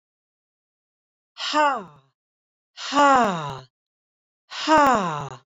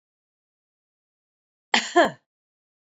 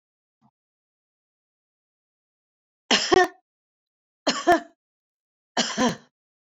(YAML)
exhalation_length: 5.5 s
exhalation_amplitude: 19232
exhalation_signal_mean_std_ratio: 0.4
cough_length: 3.0 s
cough_amplitude: 25212
cough_signal_mean_std_ratio: 0.21
three_cough_length: 6.6 s
three_cough_amplitude: 19386
three_cough_signal_mean_std_ratio: 0.27
survey_phase: beta (2021-08-13 to 2022-03-07)
age: 45-64
gender: Female
wearing_mask: 'No'
symptom_none: true
smoker_status: Ex-smoker
respiratory_condition_asthma: false
respiratory_condition_other: false
recruitment_source: REACT
submission_delay: 1 day
covid_test_result: Negative
covid_test_method: RT-qPCR